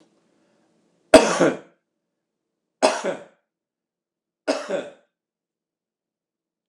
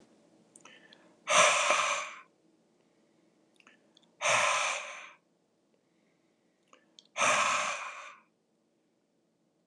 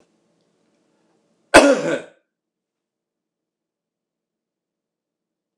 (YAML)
three_cough_length: 6.7 s
three_cough_amplitude: 32768
three_cough_signal_mean_std_ratio: 0.23
exhalation_length: 9.7 s
exhalation_amplitude: 10742
exhalation_signal_mean_std_ratio: 0.39
cough_length: 5.6 s
cough_amplitude: 32768
cough_signal_mean_std_ratio: 0.19
survey_phase: beta (2021-08-13 to 2022-03-07)
age: 65+
gender: Male
wearing_mask: 'No'
symptom_none: true
smoker_status: Ex-smoker
respiratory_condition_asthma: false
respiratory_condition_other: false
recruitment_source: REACT
submission_delay: 6 days
covid_test_result: Negative
covid_test_method: RT-qPCR